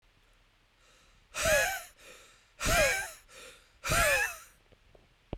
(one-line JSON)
{"exhalation_length": "5.4 s", "exhalation_amplitude": 6954, "exhalation_signal_mean_std_ratio": 0.45, "survey_phase": "beta (2021-08-13 to 2022-03-07)", "age": "18-44", "gender": "Male", "wearing_mask": "No", "symptom_headache": true, "symptom_onset": "13 days", "smoker_status": "Never smoked", "respiratory_condition_asthma": false, "respiratory_condition_other": false, "recruitment_source": "REACT", "submission_delay": "0 days", "covid_test_result": "Negative", "covid_test_method": "RT-qPCR"}